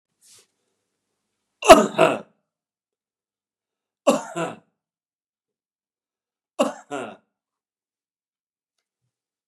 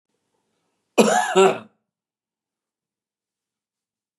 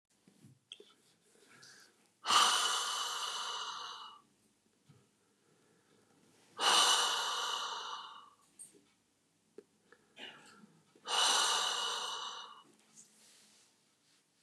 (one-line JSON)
{"three_cough_length": "9.5 s", "three_cough_amplitude": 32768, "three_cough_signal_mean_std_ratio": 0.19, "cough_length": "4.2 s", "cough_amplitude": 31569, "cough_signal_mean_std_ratio": 0.27, "exhalation_length": "14.4 s", "exhalation_amplitude": 6732, "exhalation_signal_mean_std_ratio": 0.43, "survey_phase": "beta (2021-08-13 to 2022-03-07)", "age": "45-64", "gender": "Male", "wearing_mask": "No", "symptom_none": true, "smoker_status": "Ex-smoker", "respiratory_condition_asthma": false, "respiratory_condition_other": false, "recruitment_source": "REACT", "submission_delay": "2 days", "covid_test_result": "Negative", "covid_test_method": "RT-qPCR", "influenza_a_test_result": "Negative", "influenza_b_test_result": "Negative"}